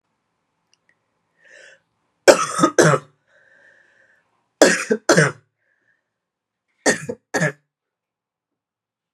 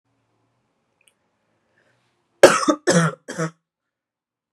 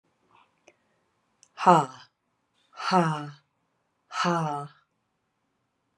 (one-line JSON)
{"three_cough_length": "9.1 s", "three_cough_amplitude": 32768, "three_cough_signal_mean_std_ratio": 0.28, "cough_length": "4.5 s", "cough_amplitude": 32768, "cough_signal_mean_std_ratio": 0.25, "exhalation_length": "6.0 s", "exhalation_amplitude": 26265, "exhalation_signal_mean_std_ratio": 0.3, "survey_phase": "beta (2021-08-13 to 2022-03-07)", "age": "18-44", "gender": "Female", "wearing_mask": "No", "symptom_cough_any": true, "symptom_runny_or_blocked_nose": true, "symptom_sore_throat": true, "symptom_onset": "4 days", "smoker_status": "Never smoked", "respiratory_condition_asthma": false, "respiratory_condition_other": false, "recruitment_source": "REACT", "submission_delay": "2 days", "covid_test_result": "Negative", "covid_test_method": "RT-qPCR"}